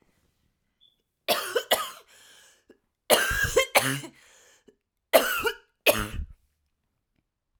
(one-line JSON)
{"three_cough_length": "7.6 s", "three_cough_amplitude": 26635, "three_cough_signal_mean_std_ratio": 0.36, "survey_phase": "alpha (2021-03-01 to 2021-08-12)", "age": "45-64", "gender": "Female", "wearing_mask": "No", "symptom_cough_any": true, "symptom_shortness_of_breath": true, "symptom_fatigue": true, "symptom_change_to_sense_of_smell_or_taste": true, "symptom_loss_of_taste": true, "symptom_onset": "3 days", "smoker_status": "Ex-smoker", "respiratory_condition_asthma": false, "respiratory_condition_other": false, "recruitment_source": "Test and Trace", "submission_delay": "2 days", "covid_test_result": "Positive", "covid_test_method": "RT-qPCR", "covid_ct_value": 14.8, "covid_ct_gene": "ORF1ab gene", "covid_ct_mean": 15.1, "covid_viral_load": "11000000 copies/ml", "covid_viral_load_category": "High viral load (>1M copies/ml)"}